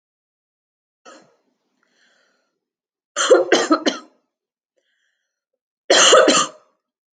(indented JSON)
{
  "three_cough_length": "7.2 s",
  "three_cough_amplitude": 30713,
  "three_cough_signal_mean_std_ratio": 0.32,
  "survey_phase": "alpha (2021-03-01 to 2021-08-12)",
  "age": "18-44",
  "gender": "Female",
  "wearing_mask": "No",
  "symptom_none": true,
  "smoker_status": "Never smoked",
  "respiratory_condition_asthma": false,
  "respiratory_condition_other": false,
  "recruitment_source": "REACT",
  "submission_delay": "2 days",
  "covid_test_result": "Negative",
  "covid_test_method": "RT-qPCR"
}